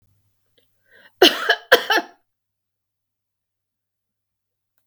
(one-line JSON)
{"cough_length": "4.9 s", "cough_amplitude": 32768, "cough_signal_mean_std_ratio": 0.22, "survey_phase": "beta (2021-08-13 to 2022-03-07)", "age": "65+", "gender": "Female", "wearing_mask": "No", "symptom_cough_any": true, "symptom_headache": true, "symptom_change_to_sense_of_smell_or_taste": true, "smoker_status": "Never smoked", "respiratory_condition_asthma": false, "respiratory_condition_other": false, "recruitment_source": "Test and Trace", "submission_delay": "0 days", "covid_test_result": "Negative", "covid_test_method": "LFT"}